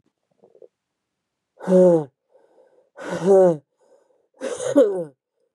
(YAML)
exhalation_length: 5.5 s
exhalation_amplitude: 21899
exhalation_signal_mean_std_ratio: 0.38
survey_phase: beta (2021-08-13 to 2022-03-07)
age: 45-64
gender: Female
wearing_mask: 'No'
symptom_cough_any: true
symptom_runny_or_blocked_nose: true
symptom_sore_throat: true
symptom_abdominal_pain: true
symptom_fatigue: true
symptom_headache: true
symptom_onset: 3 days
smoker_status: Never smoked
respiratory_condition_asthma: true
respiratory_condition_other: false
recruitment_source: Test and Trace
submission_delay: 1 day
covid_test_result: Positive
covid_test_method: RT-qPCR
covid_ct_value: 17.1
covid_ct_gene: N gene
covid_ct_mean: 17.8
covid_viral_load: 1500000 copies/ml
covid_viral_load_category: High viral load (>1M copies/ml)